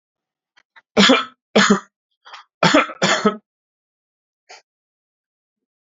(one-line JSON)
{"cough_length": "5.8 s", "cough_amplitude": 31150, "cough_signal_mean_std_ratio": 0.33, "survey_phase": "alpha (2021-03-01 to 2021-08-12)", "age": "18-44", "gender": "Male", "wearing_mask": "No", "symptom_cough_any": true, "symptom_diarrhoea": true, "smoker_status": "Current smoker (e-cigarettes or vapes only)", "respiratory_condition_asthma": false, "respiratory_condition_other": false, "recruitment_source": "REACT", "submission_delay": "2 days", "covid_test_result": "Negative", "covid_test_method": "RT-qPCR"}